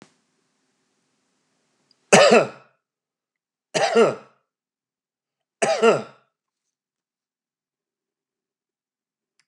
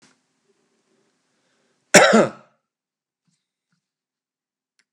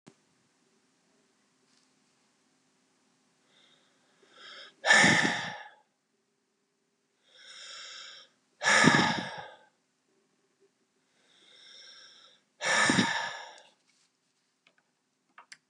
three_cough_length: 9.5 s
three_cough_amplitude: 32768
three_cough_signal_mean_std_ratio: 0.25
cough_length: 4.9 s
cough_amplitude: 32768
cough_signal_mean_std_ratio: 0.2
exhalation_length: 15.7 s
exhalation_amplitude: 16281
exhalation_signal_mean_std_ratio: 0.29
survey_phase: beta (2021-08-13 to 2022-03-07)
age: 45-64
gender: Male
wearing_mask: 'No'
symptom_fatigue: true
smoker_status: Never smoked
respiratory_condition_asthma: false
respiratory_condition_other: false
recruitment_source: REACT
submission_delay: 1 day
covid_test_result: Negative
covid_test_method: RT-qPCR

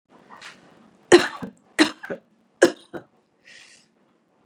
three_cough_length: 4.5 s
three_cough_amplitude: 32390
three_cough_signal_mean_std_ratio: 0.22
survey_phase: beta (2021-08-13 to 2022-03-07)
age: 65+
gender: Female
wearing_mask: 'No'
symptom_runny_or_blocked_nose: true
smoker_status: Ex-smoker
respiratory_condition_asthma: false
respiratory_condition_other: false
recruitment_source: REACT
submission_delay: 4 days
covid_test_result: Negative
covid_test_method: RT-qPCR
influenza_a_test_result: Negative
influenza_b_test_result: Negative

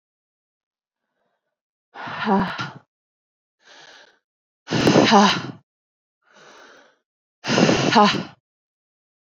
exhalation_length: 9.3 s
exhalation_amplitude: 27185
exhalation_signal_mean_std_ratio: 0.36
survey_phase: beta (2021-08-13 to 2022-03-07)
age: 45-64
gender: Female
wearing_mask: 'Yes'
symptom_cough_any: true
symptom_runny_or_blocked_nose: true
symptom_headache: true
symptom_change_to_sense_of_smell_or_taste: true
symptom_loss_of_taste: true
symptom_onset: 9 days
smoker_status: Current smoker (1 to 10 cigarettes per day)
respiratory_condition_asthma: false
respiratory_condition_other: false
recruitment_source: Test and Trace
submission_delay: 2 days
covid_test_result: Positive
covid_test_method: RT-qPCR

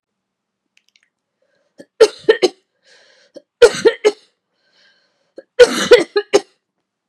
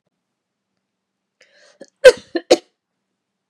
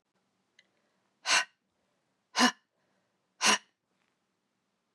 three_cough_length: 7.1 s
three_cough_amplitude: 32768
three_cough_signal_mean_std_ratio: 0.27
cough_length: 3.5 s
cough_amplitude: 32768
cough_signal_mean_std_ratio: 0.17
exhalation_length: 4.9 s
exhalation_amplitude: 10667
exhalation_signal_mean_std_ratio: 0.24
survey_phase: beta (2021-08-13 to 2022-03-07)
age: 45-64
gender: Female
wearing_mask: 'No'
symptom_new_continuous_cough: true
symptom_runny_or_blocked_nose: true
symptom_sore_throat: true
symptom_fatigue: true
symptom_headache: true
symptom_other: true
symptom_onset: 4 days
smoker_status: Never smoked
respiratory_condition_asthma: false
respiratory_condition_other: false
recruitment_source: Test and Trace
submission_delay: 2 days
covid_test_result: Positive
covid_test_method: RT-qPCR
covid_ct_value: 20.8
covid_ct_gene: N gene
covid_ct_mean: 21.4
covid_viral_load: 94000 copies/ml
covid_viral_load_category: Low viral load (10K-1M copies/ml)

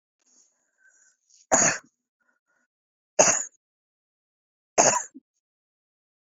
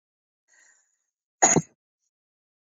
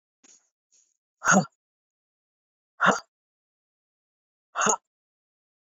three_cough_length: 6.3 s
three_cough_amplitude: 27013
three_cough_signal_mean_std_ratio: 0.26
cough_length: 2.6 s
cough_amplitude: 21220
cough_signal_mean_std_ratio: 0.2
exhalation_length: 5.7 s
exhalation_amplitude: 16175
exhalation_signal_mean_std_ratio: 0.24
survey_phase: beta (2021-08-13 to 2022-03-07)
age: 45-64
gender: Female
wearing_mask: 'No'
symptom_none: true
symptom_onset: 8 days
smoker_status: Ex-smoker
respiratory_condition_asthma: false
respiratory_condition_other: false
recruitment_source: REACT
submission_delay: 5 days
covid_test_result: Negative
covid_test_method: RT-qPCR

